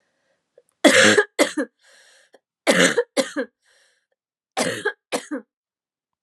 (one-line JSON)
{"three_cough_length": "6.2 s", "three_cough_amplitude": 31830, "three_cough_signal_mean_std_ratio": 0.36, "survey_phase": "alpha (2021-03-01 to 2021-08-12)", "age": "18-44", "gender": "Female", "wearing_mask": "No", "symptom_cough_any": true, "symptom_fatigue": true, "smoker_status": "Prefer not to say", "respiratory_condition_asthma": false, "respiratory_condition_other": false, "recruitment_source": "Test and Trace", "submission_delay": "2 days", "covid_test_result": "Positive", "covid_test_method": "RT-qPCR", "covid_ct_value": 23.6, "covid_ct_gene": "ORF1ab gene", "covid_ct_mean": 24.1, "covid_viral_load": "12000 copies/ml", "covid_viral_load_category": "Low viral load (10K-1M copies/ml)"}